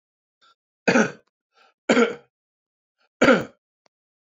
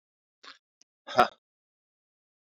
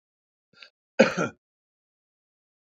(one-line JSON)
{"three_cough_length": "4.4 s", "three_cough_amplitude": 25020, "three_cough_signal_mean_std_ratio": 0.29, "exhalation_length": "2.5 s", "exhalation_amplitude": 21228, "exhalation_signal_mean_std_ratio": 0.16, "cough_length": "2.7 s", "cough_amplitude": 22934, "cough_signal_mean_std_ratio": 0.2, "survey_phase": "beta (2021-08-13 to 2022-03-07)", "age": "65+", "gender": "Male", "wearing_mask": "No", "symptom_none": true, "smoker_status": "Ex-smoker", "respiratory_condition_asthma": true, "respiratory_condition_other": false, "recruitment_source": "REACT", "submission_delay": "2 days", "covid_test_result": "Negative", "covid_test_method": "RT-qPCR"}